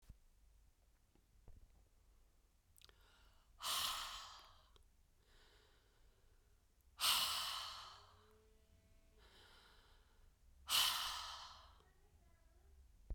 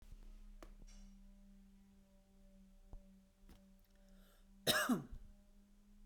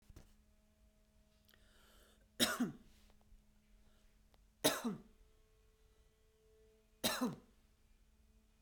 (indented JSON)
{
  "exhalation_length": "13.1 s",
  "exhalation_amplitude": 2819,
  "exhalation_signal_mean_std_ratio": 0.37,
  "cough_length": "6.1 s",
  "cough_amplitude": 3810,
  "cough_signal_mean_std_ratio": 0.37,
  "three_cough_length": "8.6 s",
  "three_cough_amplitude": 4105,
  "three_cough_signal_mean_std_ratio": 0.29,
  "survey_phase": "beta (2021-08-13 to 2022-03-07)",
  "age": "45-64",
  "gender": "Female",
  "wearing_mask": "No",
  "symptom_headache": true,
  "smoker_status": "Ex-smoker",
  "respiratory_condition_asthma": false,
  "respiratory_condition_other": false,
  "recruitment_source": "Test and Trace",
  "submission_delay": "2 days",
  "covid_test_result": "Positive",
  "covid_test_method": "RT-qPCR",
  "covid_ct_value": 17.7,
  "covid_ct_gene": "ORF1ab gene",
  "covid_ct_mean": 18.2,
  "covid_viral_load": "1000000 copies/ml",
  "covid_viral_load_category": "High viral load (>1M copies/ml)"
}